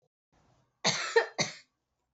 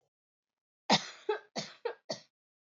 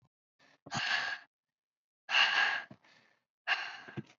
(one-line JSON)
{"cough_length": "2.1 s", "cough_amplitude": 8973, "cough_signal_mean_std_ratio": 0.34, "three_cough_length": "2.7 s", "three_cough_amplitude": 8877, "three_cough_signal_mean_std_ratio": 0.29, "exhalation_length": "4.2 s", "exhalation_amplitude": 6305, "exhalation_signal_mean_std_ratio": 0.43, "survey_phase": "alpha (2021-03-01 to 2021-08-12)", "age": "18-44", "gender": "Female", "wearing_mask": "No", "symptom_cough_any": true, "symptom_shortness_of_breath": true, "symptom_fatigue": true, "symptom_fever_high_temperature": true, "symptom_headache": true, "symptom_change_to_sense_of_smell_or_taste": true, "symptom_loss_of_taste": true, "symptom_onset": "3 days", "smoker_status": "Never smoked", "respiratory_condition_asthma": false, "respiratory_condition_other": false, "recruitment_source": "Test and Trace", "submission_delay": "1 day", "covid_test_result": "Positive", "covid_test_method": "RT-qPCR"}